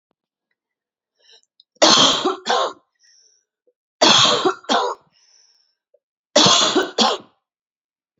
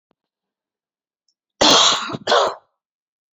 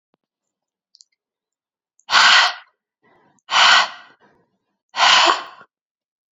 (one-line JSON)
{"three_cough_length": "8.2 s", "three_cough_amplitude": 32768, "three_cough_signal_mean_std_ratio": 0.41, "cough_length": "3.3 s", "cough_amplitude": 29777, "cough_signal_mean_std_ratio": 0.37, "exhalation_length": "6.3 s", "exhalation_amplitude": 32089, "exhalation_signal_mean_std_ratio": 0.36, "survey_phase": "beta (2021-08-13 to 2022-03-07)", "age": "18-44", "gender": "Female", "wearing_mask": "No", "symptom_cough_any": true, "symptom_runny_or_blocked_nose": true, "symptom_fatigue": true, "symptom_headache": true, "symptom_other": true, "symptom_onset": "4 days", "smoker_status": "Never smoked", "respiratory_condition_asthma": false, "respiratory_condition_other": false, "recruitment_source": "Test and Trace", "submission_delay": "2 days", "covid_test_result": "Positive", "covid_test_method": "RT-qPCR", "covid_ct_value": 14.5, "covid_ct_gene": "ORF1ab gene"}